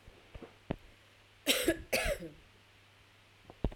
cough_length: 3.8 s
cough_amplitude: 6002
cough_signal_mean_std_ratio: 0.39
survey_phase: beta (2021-08-13 to 2022-03-07)
age: 45-64
gender: Female
wearing_mask: 'No'
symptom_none: true
smoker_status: Ex-smoker
respiratory_condition_asthma: false
respiratory_condition_other: false
recruitment_source: REACT
submission_delay: 1 day
covid_test_result: Negative
covid_test_method: RT-qPCR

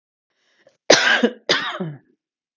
cough_length: 2.6 s
cough_amplitude: 32768
cough_signal_mean_std_ratio: 0.39
survey_phase: alpha (2021-03-01 to 2021-08-12)
age: 45-64
gender: Female
wearing_mask: 'No'
symptom_cough_any: true
symptom_fatigue: true
smoker_status: Never smoked
respiratory_condition_asthma: false
respiratory_condition_other: false
recruitment_source: REACT
submission_delay: 2 days
covid_test_result: Negative
covid_test_method: RT-qPCR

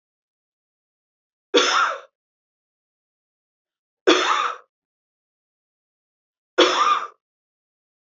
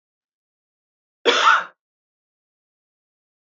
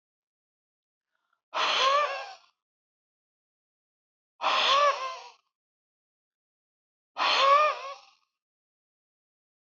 three_cough_length: 8.2 s
three_cough_amplitude: 29142
three_cough_signal_mean_std_ratio: 0.31
cough_length: 3.5 s
cough_amplitude: 23175
cough_signal_mean_std_ratio: 0.25
exhalation_length: 9.6 s
exhalation_amplitude: 10908
exhalation_signal_mean_std_ratio: 0.37
survey_phase: beta (2021-08-13 to 2022-03-07)
age: 45-64
gender: Female
wearing_mask: 'No'
symptom_none: true
smoker_status: Never smoked
respiratory_condition_asthma: false
respiratory_condition_other: false
recruitment_source: REACT
submission_delay: 2 days
covid_test_result: Negative
covid_test_method: RT-qPCR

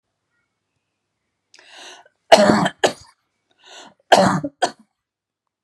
cough_length: 5.6 s
cough_amplitude: 32768
cough_signal_mean_std_ratio: 0.29
survey_phase: alpha (2021-03-01 to 2021-08-12)
age: 45-64
gender: Female
wearing_mask: 'No'
symptom_none: true
smoker_status: Never smoked
respiratory_condition_asthma: false
respiratory_condition_other: false
recruitment_source: REACT
submission_delay: 1 day
covid_test_result: Negative
covid_test_method: RT-qPCR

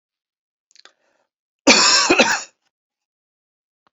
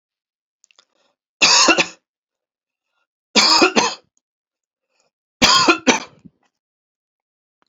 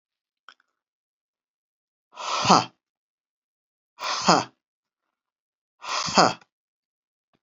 cough_length: 3.9 s
cough_amplitude: 30405
cough_signal_mean_std_ratio: 0.33
three_cough_length: 7.7 s
three_cough_amplitude: 32768
three_cough_signal_mean_std_ratio: 0.34
exhalation_length: 7.4 s
exhalation_amplitude: 31823
exhalation_signal_mean_std_ratio: 0.26
survey_phase: beta (2021-08-13 to 2022-03-07)
age: 65+
gender: Male
wearing_mask: 'No'
symptom_none: true
smoker_status: Never smoked
respiratory_condition_asthma: false
respiratory_condition_other: false
recruitment_source: REACT
submission_delay: 3 days
covid_test_result: Negative
covid_test_method: RT-qPCR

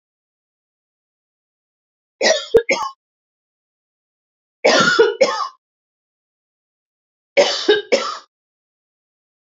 three_cough_length: 9.6 s
three_cough_amplitude: 30965
three_cough_signal_mean_std_ratio: 0.33
survey_phase: beta (2021-08-13 to 2022-03-07)
age: 45-64
gender: Female
wearing_mask: 'No'
symptom_none: true
smoker_status: Never smoked
respiratory_condition_asthma: false
respiratory_condition_other: false
recruitment_source: REACT
submission_delay: 0 days
covid_test_result: Negative
covid_test_method: RT-qPCR
influenza_a_test_result: Negative
influenza_b_test_result: Negative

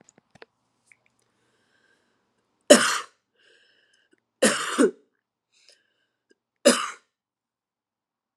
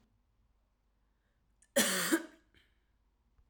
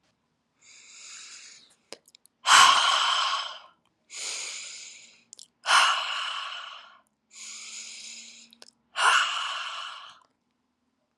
three_cough_length: 8.4 s
three_cough_amplitude: 32162
three_cough_signal_mean_std_ratio: 0.22
cough_length: 3.5 s
cough_amplitude: 6139
cough_signal_mean_std_ratio: 0.29
exhalation_length: 11.2 s
exhalation_amplitude: 26147
exhalation_signal_mean_std_ratio: 0.4
survey_phase: alpha (2021-03-01 to 2021-08-12)
age: 18-44
gender: Female
wearing_mask: 'No'
symptom_cough_any: true
symptom_fatigue: true
symptom_fever_high_temperature: true
symptom_change_to_sense_of_smell_or_taste: true
symptom_loss_of_taste: true
symptom_onset: 4 days
smoker_status: Never smoked
respiratory_condition_asthma: false
respiratory_condition_other: false
recruitment_source: Test and Trace
submission_delay: 2 days
covid_test_result: Positive
covid_test_method: RT-qPCR
covid_ct_value: 16.5
covid_ct_gene: ORF1ab gene
covid_ct_mean: 16.9
covid_viral_load: 2900000 copies/ml
covid_viral_load_category: High viral load (>1M copies/ml)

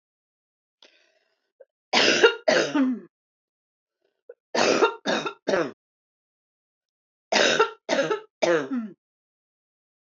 three_cough_length: 10.1 s
three_cough_amplitude: 21450
three_cough_signal_mean_std_ratio: 0.41
survey_phase: beta (2021-08-13 to 2022-03-07)
age: 45-64
gender: Female
wearing_mask: 'No'
symptom_none: true
smoker_status: Never smoked
respiratory_condition_asthma: false
respiratory_condition_other: false
recruitment_source: REACT
submission_delay: 2 days
covid_test_result: Negative
covid_test_method: RT-qPCR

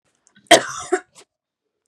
cough_length: 1.9 s
cough_amplitude: 32768
cough_signal_mean_std_ratio: 0.24
survey_phase: beta (2021-08-13 to 2022-03-07)
age: 18-44
gender: Female
wearing_mask: 'No'
symptom_none: true
smoker_status: Never smoked
respiratory_condition_asthma: false
respiratory_condition_other: false
recruitment_source: Test and Trace
submission_delay: 1 day
covid_test_result: Negative
covid_test_method: ePCR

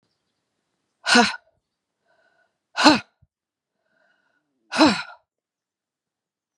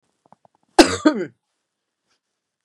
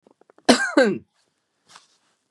exhalation_length: 6.6 s
exhalation_amplitude: 32761
exhalation_signal_mean_std_ratio: 0.24
cough_length: 2.6 s
cough_amplitude: 32768
cough_signal_mean_std_ratio: 0.23
three_cough_length: 2.3 s
three_cough_amplitude: 32767
three_cough_signal_mean_std_ratio: 0.31
survey_phase: beta (2021-08-13 to 2022-03-07)
age: 45-64
gender: Female
wearing_mask: 'No'
symptom_runny_or_blocked_nose: true
smoker_status: Ex-smoker
respiratory_condition_asthma: false
respiratory_condition_other: false
recruitment_source: REACT
submission_delay: 2 days
covid_test_result: Negative
covid_test_method: RT-qPCR
influenza_a_test_result: Negative
influenza_b_test_result: Negative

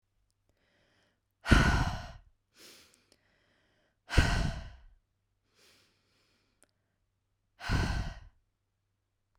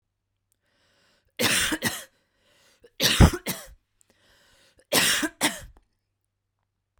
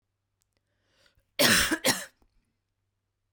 exhalation_length: 9.4 s
exhalation_amplitude: 15664
exhalation_signal_mean_std_ratio: 0.29
three_cough_length: 7.0 s
three_cough_amplitude: 26142
three_cough_signal_mean_std_ratio: 0.32
cough_length: 3.3 s
cough_amplitude: 14623
cough_signal_mean_std_ratio: 0.31
survey_phase: beta (2021-08-13 to 2022-03-07)
age: 18-44
gender: Female
wearing_mask: 'No'
symptom_fatigue: true
symptom_onset: 12 days
smoker_status: Never smoked
respiratory_condition_asthma: false
respiratory_condition_other: false
recruitment_source: REACT
submission_delay: 3 days
covid_test_result: Negative
covid_test_method: RT-qPCR
influenza_a_test_result: Negative
influenza_b_test_result: Negative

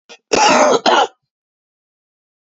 cough_length: 2.6 s
cough_amplitude: 29748
cough_signal_mean_std_ratio: 0.44
survey_phase: beta (2021-08-13 to 2022-03-07)
age: 45-64
gender: Male
wearing_mask: 'No'
symptom_cough_any: true
symptom_runny_or_blocked_nose: true
symptom_sore_throat: true
symptom_fatigue: true
symptom_fever_high_temperature: true
symptom_headache: true
symptom_onset: 3 days
smoker_status: Ex-smoker
respiratory_condition_asthma: false
respiratory_condition_other: false
recruitment_source: Test and Trace
submission_delay: 2 days
covid_test_result: Positive
covid_test_method: RT-qPCR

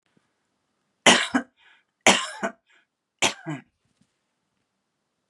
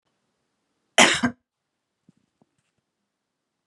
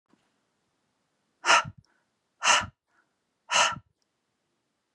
three_cough_length: 5.3 s
three_cough_amplitude: 32574
three_cough_signal_mean_std_ratio: 0.26
cough_length: 3.7 s
cough_amplitude: 27776
cough_signal_mean_std_ratio: 0.2
exhalation_length: 4.9 s
exhalation_amplitude: 15930
exhalation_signal_mean_std_ratio: 0.28
survey_phase: beta (2021-08-13 to 2022-03-07)
age: 45-64
gender: Female
wearing_mask: 'No'
symptom_none: true
smoker_status: Never smoked
respiratory_condition_asthma: false
respiratory_condition_other: false
recruitment_source: REACT
submission_delay: 2 days
covid_test_result: Negative
covid_test_method: RT-qPCR
influenza_a_test_result: Negative
influenza_b_test_result: Negative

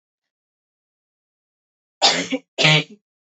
cough_length: 3.3 s
cough_amplitude: 29328
cough_signal_mean_std_ratio: 0.3
survey_phase: beta (2021-08-13 to 2022-03-07)
age: 18-44
gender: Female
wearing_mask: 'No'
symptom_shortness_of_breath: true
symptom_sore_throat: true
symptom_abdominal_pain: true
symptom_diarrhoea: true
symptom_fatigue: true
symptom_headache: true
smoker_status: Never smoked
respiratory_condition_asthma: true
respiratory_condition_other: false
recruitment_source: REACT
submission_delay: 2 days
covid_test_result: Negative
covid_test_method: RT-qPCR
influenza_a_test_result: Negative
influenza_b_test_result: Negative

